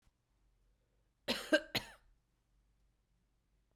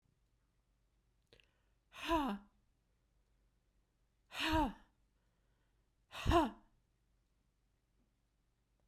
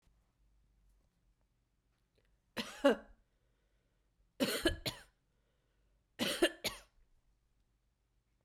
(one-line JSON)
{"cough_length": "3.8 s", "cough_amplitude": 4680, "cough_signal_mean_std_ratio": 0.21, "exhalation_length": "8.9 s", "exhalation_amplitude": 3116, "exhalation_signal_mean_std_ratio": 0.28, "three_cough_length": "8.4 s", "three_cough_amplitude": 5873, "three_cough_signal_mean_std_ratio": 0.25, "survey_phase": "beta (2021-08-13 to 2022-03-07)", "age": "45-64", "gender": "Female", "wearing_mask": "No", "symptom_fatigue": true, "symptom_onset": "12 days", "smoker_status": "Prefer not to say", "respiratory_condition_asthma": false, "respiratory_condition_other": false, "recruitment_source": "REACT", "submission_delay": "2 days", "covid_test_result": "Negative", "covid_test_method": "RT-qPCR"}